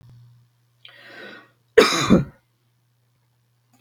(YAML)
cough_length: 3.8 s
cough_amplitude: 32768
cough_signal_mean_std_ratio: 0.26
survey_phase: beta (2021-08-13 to 2022-03-07)
age: 65+
gender: Female
wearing_mask: 'No'
symptom_none: true
smoker_status: Ex-smoker
respiratory_condition_asthma: false
respiratory_condition_other: false
recruitment_source: REACT
submission_delay: 1 day
covid_test_result: Negative
covid_test_method: RT-qPCR
influenza_a_test_result: Negative
influenza_b_test_result: Negative